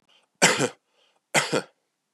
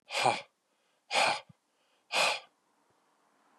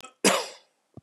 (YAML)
three_cough_length: 2.1 s
three_cough_amplitude: 21299
three_cough_signal_mean_std_ratio: 0.36
exhalation_length: 3.6 s
exhalation_amplitude: 8735
exhalation_signal_mean_std_ratio: 0.38
cough_length: 1.0 s
cough_amplitude: 14993
cough_signal_mean_std_ratio: 0.36
survey_phase: beta (2021-08-13 to 2022-03-07)
age: 18-44
gender: Male
wearing_mask: 'No'
symptom_cough_any: true
symptom_runny_or_blocked_nose: true
symptom_sore_throat: true
symptom_diarrhoea: true
symptom_fever_high_temperature: true
symptom_headache: true
symptom_other: true
smoker_status: Never smoked
respiratory_condition_asthma: false
respiratory_condition_other: false
recruitment_source: Test and Trace
submission_delay: 2 days
covid_test_result: Positive
covid_test_method: RT-qPCR
covid_ct_value: 19.6
covid_ct_gene: ORF1ab gene
covid_ct_mean: 20.0
covid_viral_load: 270000 copies/ml
covid_viral_load_category: Low viral load (10K-1M copies/ml)